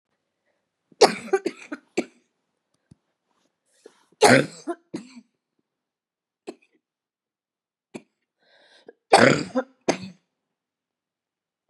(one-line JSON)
{"three_cough_length": "11.7 s", "three_cough_amplitude": 32767, "three_cough_signal_mean_std_ratio": 0.22, "survey_phase": "beta (2021-08-13 to 2022-03-07)", "age": "45-64", "gender": "Female", "wearing_mask": "No", "symptom_cough_any": true, "symptom_runny_or_blocked_nose": true, "symptom_sore_throat": true, "symptom_fatigue": true, "symptom_headache": true, "symptom_onset": "7 days", "smoker_status": "Never smoked", "respiratory_condition_asthma": false, "respiratory_condition_other": false, "recruitment_source": "Test and Trace", "submission_delay": "2 days", "covid_test_result": "Positive", "covid_test_method": "RT-qPCR", "covid_ct_value": 30.6, "covid_ct_gene": "ORF1ab gene", "covid_ct_mean": 31.3, "covid_viral_load": "54 copies/ml", "covid_viral_load_category": "Minimal viral load (< 10K copies/ml)"}